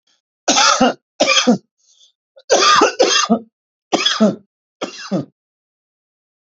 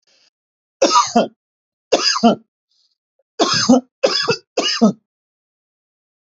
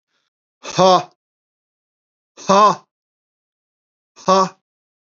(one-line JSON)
{"cough_length": "6.6 s", "cough_amplitude": 32768, "cough_signal_mean_std_ratio": 0.48, "three_cough_length": "6.4 s", "three_cough_amplitude": 32106, "three_cough_signal_mean_std_ratio": 0.41, "exhalation_length": "5.1 s", "exhalation_amplitude": 29666, "exhalation_signal_mean_std_ratio": 0.3, "survey_phase": "beta (2021-08-13 to 2022-03-07)", "age": "45-64", "gender": "Male", "wearing_mask": "No", "symptom_none": true, "smoker_status": "Never smoked", "respiratory_condition_asthma": false, "respiratory_condition_other": false, "recruitment_source": "REACT", "submission_delay": "6 days", "covid_test_result": "Negative", "covid_test_method": "RT-qPCR", "influenza_a_test_result": "Negative", "influenza_b_test_result": "Negative"}